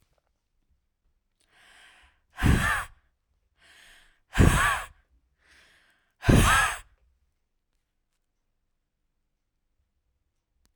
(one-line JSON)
{"exhalation_length": "10.8 s", "exhalation_amplitude": 19478, "exhalation_signal_mean_std_ratio": 0.28, "survey_phase": "beta (2021-08-13 to 2022-03-07)", "age": "18-44", "gender": "Female", "wearing_mask": "No", "symptom_runny_or_blocked_nose": true, "symptom_sore_throat": true, "symptom_onset": "13 days", "smoker_status": "Ex-smoker", "respiratory_condition_asthma": false, "respiratory_condition_other": false, "recruitment_source": "REACT", "submission_delay": "1 day", "covid_test_result": "Negative", "covid_test_method": "RT-qPCR", "influenza_a_test_result": "Negative", "influenza_b_test_result": "Negative"}